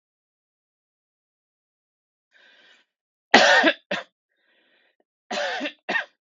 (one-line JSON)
{"three_cough_length": "6.4 s", "three_cough_amplitude": 32768, "three_cough_signal_mean_std_ratio": 0.27, "survey_phase": "beta (2021-08-13 to 2022-03-07)", "age": "18-44", "gender": "Male", "wearing_mask": "No", "symptom_none": true, "smoker_status": "Ex-smoker", "respiratory_condition_asthma": false, "respiratory_condition_other": false, "recruitment_source": "REACT", "submission_delay": "1 day", "covid_test_result": "Negative", "covid_test_method": "RT-qPCR", "influenza_a_test_result": "Negative", "influenza_b_test_result": "Negative"}